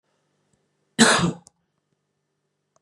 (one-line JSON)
{"cough_length": "2.8 s", "cough_amplitude": 29643, "cough_signal_mean_std_ratio": 0.26, "survey_phase": "beta (2021-08-13 to 2022-03-07)", "age": "18-44", "gender": "Male", "wearing_mask": "No", "symptom_runny_or_blocked_nose": true, "symptom_headache": true, "symptom_onset": "3 days", "smoker_status": "Never smoked", "respiratory_condition_asthma": true, "respiratory_condition_other": false, "recruitment_source": "Test and Trace", "submission_delay": "2 days", "covid_test_result": "Positive", "covid_test_method": "RT-qPCR", "covid_ct_value": 27.5, "covid_ct_gene": "ORF1ab gene"}